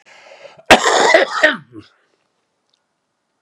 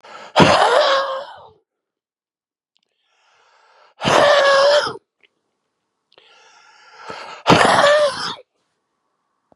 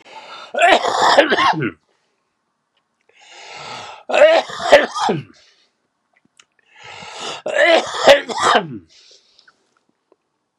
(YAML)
cough_length: 3.4 s
cough_amplitude: 32768
cough_signal_mean_std_ratio: 0.37
exhalation_length: 9.6 s
exhalation_amplitude: 32768
exhalation_signal_mean_std_ratio: 0.44
three_cough_length: 10.6 s
three_cough_amplitude: 32768
three_cough_signal_mean_std_ratio: 0.43
survey_phase: beta (2021-08-13 to 2022-03-07)
age: 65+
gender: Male
wearing_mask: 'No'
symptom_cough_any: true
symptom_runny_or_blocked_nose: true
symptom_sore_throat: true
symptom_fatigue: true
smoker_status: Never smoked
respiratory_condition_asthma: true
respiratory_condition_other: false
recruitment_source: Test and Trace
submission_delay: 1 day
covid_test_result: Positive
covid_test_method: RT-qPCR
covid_ct_value: 13.1
covid_ct_gene: ORF1ab gene